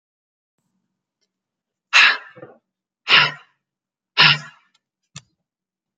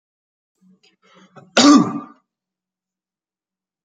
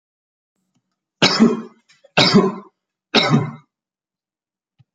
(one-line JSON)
{"exhalation_length": "6.0 s", "exhalation_amplitude": 30991, "exhalation_signal_mean_std_ratio": 0.26, "cough_length": "3.8 s", "cough_amplitude": 32688, "cough_signal_mean_std_ratio": 0.25, "three_cough_length": "4.9 s", "three_cough_amplitude": 32767, "three_cough_signal_mean_std_ratio": 0.36, "survey_phase": "beta (2021-08-13 to 2022-03-07)", "age": "18-44", "gender": "Male", "wearing_mask": "No", "symptom_none": true, "smoker_status": "Never smoked", "respiratory_condition_asthma": false, "respiratory_condition_other": false, "recruitment_source": "REACT", "submission_delay": "1 day", "covid_test_result": "Negative", "covid_test_method": "RT-qPCR", "covid_ct_value": 46.0, "covid_ct_gene": "N gene"}